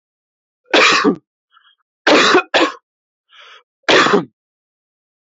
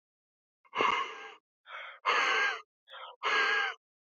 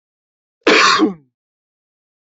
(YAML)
three_cough_length: 5.2 s
three_cough_amplitude: 31410
three_cough_signal_mean_std_ratio: 0.42
exhalation_length: 4.2 s
exhalation_amplitude: 6719
exhalation_signal_mean_std_ratio: 0.53
cough_length: 2.3 s
cough_amplitude: 30319
cough_signal_mean_std_ratio: 0.37
survey_phase: alpha (2021-03-01 to 2021-08-12)
age: 18-44
gender: Male
wearing_mask: 'No'
symptom_none: true
smoker_status: Never smoked
respiratory_condition_asthma: false
respiratory_condition_other: false
recruitment_source: REACT
submission_delay: 1 day
covid_test_result: Negative
covid_test_method: RT-qPCR